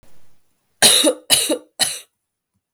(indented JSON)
{
  "three_cough_length": "2.7 s",
  "three_cough_amplitude": 32768,
  "three_cough_signal_mean_std_ratio": 0.42,
  "survey_phase": "beta (2021-08-13 to 2022-03-07)",
  "age": "18-44",
  "gender": "Female",
  "wearing_mask": "No",
  "symptom_cough_any": true,
  "symptom_runny_or_blocked_nose": true,
  "symptom_fatigue": true,
  "symptom_headache": true,
  "symptom_onset": "3 days",
  "smoker_status": "Never smoked",
  "respiratory_condition_asthma": false,
  "respiratory_condition_other": false,
  "recruitment_source": "Test and Trace",
  "submission_delay": "2 days",
  "covid_test_result": "Positive",
  "covid_test_method": "RT-qPCR",
  "covid_ct_value": 24.4,
  "covid_ct_gene": "ORF1ab gene"
}